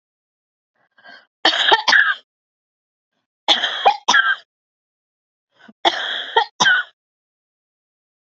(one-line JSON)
{"three_cough_length": "8.3 s", "three_cough_amplitude": 30202, "three_cough_signal_mean_std_ratio": 0.37, "survey_phase": "beta (2021-08-13 to 2022-03-07)", "age": "45-64", "gender": "Female", "wearing_mask": "No", "symptom_runny_or_blocked_nose": true, "symptom_sore_throat": true, "symptom_onset": "2 days", "smoker_status": "Never smoked", "respiratory_condition_asthma": false, "respiratory_condition_other": false, "recruitment_source": "Test and Trace", "submission_delay": "1 day", "covid_test_result": "Positive", "covid_test_method": "RT-qPCR", "covid_ct_value": 26.8, "covid_ct_gene": "ORF1ab gene", "covid_ct_mean": 27.2, "covid_viral_load": "1200 copies/ml", "covid_viral_load_category": "Minimal viral load (< 10K copies/ml)"}